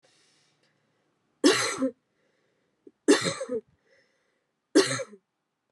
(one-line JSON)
{"three_cough_length": "5.7 s", "three_cough_amplitude": 14894, "three_cough_signal_mean_std_ratio": 0.31, "survey_phase": "beta (2021-08-13 to 2022-03-07)", "age": "18-44", "gender": "Female", "wearing_mask": "No", "symptom_cough_any": true, "symptom_runny_or_blocked_nose": true, "symptom_sore_throat": true, "symptom_headache": true, "symptom_onset": "3 days", "smoker_status": "Ex-smoker", "respiratory_condition_asthma": false, "respiratory_condition_other": false, "recruitment_source": "Test and Trace", "submission_delay": "1 day", "covid_test_result": "Positive", "covid_test_method": "RT-qPCR"}